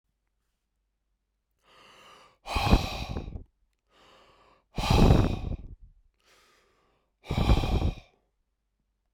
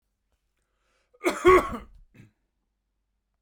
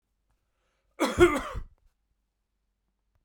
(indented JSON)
{
  "exhalation_length": "9.1 s",
  "exhalation_amplitude": 15786,
  "exhalation_signal_mean_std_ratio": 0.35,
  "three_cough_length": "3.4 s",
  "three_cough_amplitude": 19513,
  "three_cough_signal_mean_std_ratio": 0.24,
  "cough_length": "3.2 s",
  "cough_amplitude": 15523,
  "cough_signal_mean_std_ratio": 0.26,
  "survey_phase": "beta (2021-08-13 to 2022-03-07)",
  "age": "45-64",
  "gender": "Male",
  "wearing_mask": "No",
  "symptom_runny_or_blocked_nose": true,
  "smoker_status": "Never smoked",
  "respiratory_condition_asthma": false,
  "respiratory_condition_other": false,
  "recruitment_source": "REACT",
  "submission_delay": "2 days",
  "covid_test_result": "Negative",
  "covid_test_method": "RT-qPCR"
}